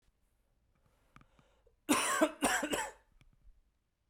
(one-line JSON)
{"cough_length": "4.1 s", "cough_amplitude": 6063, "cough_signal_mean_std_ratio": 0.37, "survey_phase": "beta (2021-08-13 to 2022-03-07)", "age": "18-44", "gender": "Male", "wearing_mask": "No", "symptom_cough_any": true, "symptom_new_continuous_cough": true, "symptom_runny_or_blocked_nose": true, "symptom_fatigue": true, "symptom_fever_high_temperature": true, "symptom_headache": true, "symptom_change_to_sense_of_smell_or_taste": true, "symptom_loss_of_taste": true, "symptom_other": true, "symptom_onset": "3 days", "smoker_status": "Never smoked", "respiratory_condition_asthma": false, "respiratory_condition_other": false, "recruitment_source": "Test and Trace", "submission_delay": "1 day", "covid_test_result": "Positive", "covid_test_method": "RT-qPCR", "covid_ct_value": 14.9, "covid_ct_gene": "ORF1ab gene", "covid_ct_mean": 15.4, "covid_viral_load": "9100000 copies/ml", "covid_viral_load_category": "High viral load (>1M copies/ml)"}